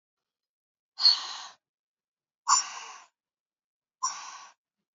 {"exhalation_length": "4.9 s", "exhalation_amplitude": 14089, "exhalation_signal_mean_std_ratio": 0.27, "survey_phase": "beta (2021-08-13 to 2022-03-07)", "age": "18-44", "gender": "Female", "wearing_mask": "No", "symptom_cough_any": true, "symptom_runny_or_blocked_nose": true, "symptom_sore_throat": true, "symptom_fatigue": true, "symptom_fever_high_temperature": true, "symptom_change_to_sense_of_smell_or_taste": true, "symptom_onset": "5 days", "smoker_status": "Never smoked", "respiratory_condition_asthma": false, "respiratory_condition_other": false, "recruitment_source": "Test and Trace", "submission_delay": "2 days", "covid_test_result": "Positive", "covid_test_method": "RT-qPCR", "covid_ct_value": 23.0, "covid_ct_gene": "N gene"}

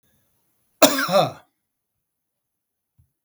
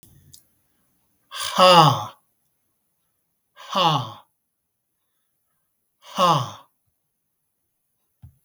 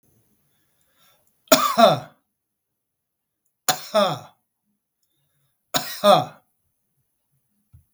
{"cough_length": "3.2 s", "cough_amplitude": 32768, "cough_signal_mean_std_ratio": 0.26, "exhalation_length": "8.4 s", "exhalation_amplitude": 32310, "exhalation_signal_mean_std_ratio": 0.28, "three_cough_length": "7.9 s", "three_cough_amplitude": 32768, "three_cough_signal_mean_std_ratio": 0.27, "survey_phase": "beta (2021-08-13 to 2022-03-07)", "age": "65+", "gender": "Male", "wearing_mask": "No", "symptom_none": true, "smoker_status": "Never smoked", "respiratory_condition_asthma": false, "respiratory_condition_other": false, "recruitment_source": "REACT", "submission_delay": "2 days", "covid_test_result": "Negative", "covid_test_method": "RT-qPCR", "influenza_a_test_result": "Negative", "influenza_b_test_result": "Negative"}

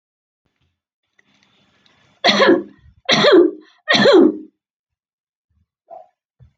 {"three_cough_length": "6.6 s", "three_cough_amplitude": 28476, "three_cough_signal_mean_std_ratio": 0.37, "survey_phase": "beta (2021-08-13 to 2022-03-07)", "age": "65+", "gender": "Female", "wearing_mask": "No", "symptom_none": true, "smoker_status": "Never smoked", "respiratory_condition_asthma": false, "respiratory_condition_other": false, "recruitment_source": "REACT", "submission_delay": "2 days", "covid_test_result": "Negative", "covid_test_method": "RT-qPCR"}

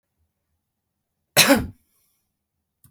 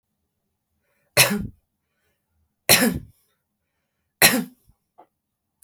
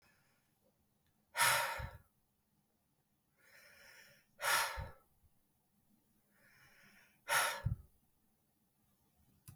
{"cough_length": "2.9 s", "cough_amplitude": 32766, "cough_signal_mean_std_ratio": 0.23, "three_cough_length": "5.6 s", "three_cough_amplitude": 32768, "three_cough_signal_mean_std_ratio": 0.26, "exhalation_length": "9.6 s", "exhalation_amplitude": 4727, "exhalation_signal_mean_std_ratio": 0.31, "survey_phase": "beta (2021-08-13 to 2022-03-07)", "age": "45-64", "gender": "Female", "wearing_mask": "No", "symptom_none": true, "smoker_status": "Current smoker (11 or more cigarettes per day)", "respiratory_condition_asthma": false, "respiratory_condition_other": false, "recruitment_source": "REACT", "submission_delay": "1 day", "covid_test_result": "Negative", "covid_test_method": "RT-qPCR", "influenza_a_test_result": "Negative", "influenza_b_test_result": "Negative"}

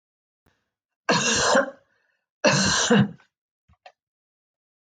{"cough_length": "4.9 s", "cough_amplitude": 17984, "cough_signal_mean_std_ratio": 0.42, "survey_phase": "alpha (2021-03-01 to 2021-08-12)", "age": "45-64", "gender": "Female", "wearing_mask": "No", "symptom_none": true, "smoker_status": "Never smoked", "respiratory_condition_asthma": false, "respiratory_condition_other": false, "recruitment_source": "REACT", "submission_delay": "1 day", "covid_test_result": "Negative", "covid_test_method": "RT-qPCR"}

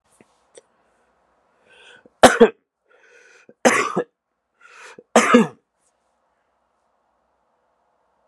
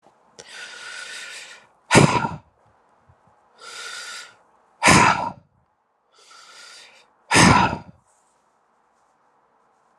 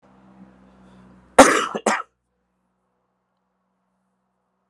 {"three_cough_length": "8.3 s", "three_cough_amplitude": 32768, "three_cough_signal_mean_std_ratio": 0.23, "exhalation_length": "10.0 s", "exhalation_amplitude": 32414, "exhalation_signal_mean_std_ratio": 0.31, "cough_length": "4.7 s", "cough_amplitude": 32768, "cough_signal_mean_std_ratio": 0.21, "survey_phase": "alpha (2021-03-01 to 2021-08-12)", "age": "45-64", "gender": "Male", "wearing_mask": "No", "symptom_cough_any": true, "symptom_fatigue": true, "symptom_headache": true, "smoker_status": "Ex-smoker", "respiratory_condition_asthma": false, "respiratory_condition_other": false, "recruitment_source": "Test and Trace", "submission_delay": "2 days", "covid_test_result": "Positive", "covid_test_method": "RT-qPCR"}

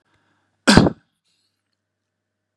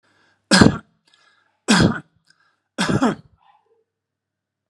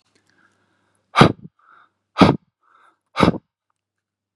{"cough_length": "2.6 s", "cough_amplitude": 32768, "cough_signal_mean_std_ratio": 0.22, "three_cough_length": "4.7 s", "three_cough_amplitude": 32768, "three_cough_signal_mean_std_ratio": 0.32, "exhalation_length": "4.4 s", "exhalation_amplitude": 32768, "exhalation_signal_mean_std_ratio": 0.24, "survey_phase": "beta (2021-08-13 to 2022-03-07)", "age": "45-64", "gender": "Male", "wearing_mask": "No", "symptom_none": true, "smoker_status": "Never smoked", "respiratory_condition_asthma": false, "respiratory_condition_other": false, "recruitment_source": "REACT", "submission_delay": "1 day", "covid_test_result": "Negative", "covid_test_method": "RT-qPCR"}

